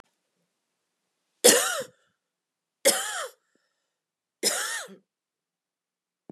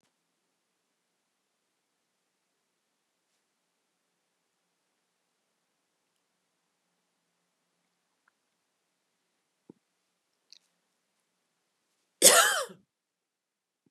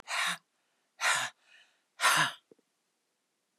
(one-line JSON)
{"three_cough_length": "6.3 s", "three_cough_amplitude": 28915, "three_cough_signal_mean_std_ratio": 0.27, "cough_length": "13.9 s", "cough_amplitude": 26160, "cough_signal_mean_std_ratio": 0.13, "exhalation_length": "3.6 s", "exhalation_amplitude": 6667, "exhalation_signal_mean_std_ratio": 0.39, "survey_phase": "beta (2021-08-13 to 2022-03-07)", "age": "65+", "gender": "Female", "wearing_mask": "No", "symptom_sore_throat": true, "symptom_fatigue": true, "smoker_status": "Ex-smoker", "respiratory_condition_asthma": false, "respiratory_condition_other": false, "recruitment_source": "REACT", "submission_delay": "4 days", "covid_test_result": "Negative", "covid_test_method": "RT-qPCR", "influenza_a_test_result": "Negative", "influenza_b_test_result": "Negative"}